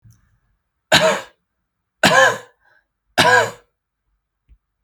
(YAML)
three_cough_length: 4.8 s
three_cough_amplitude: 32768
three_cough_signal_mean_std_ratio: 0.35
survey_phase: beta (2021-08-13 to 2022-03-07)
age: 18-44
gender: Male
wearing_mask: 'No'
symptom_none: true
smoker_status: Never smoked
respiratory_condition_asthma: false
respiratory_condition_other: false
recruitment_source: REACT
submission_delay: 1 day
covid_test_result: Negative
covid_test_method: RT-qPCR
influenza_a_test_result: Negative
influenza_b_test_result: Negative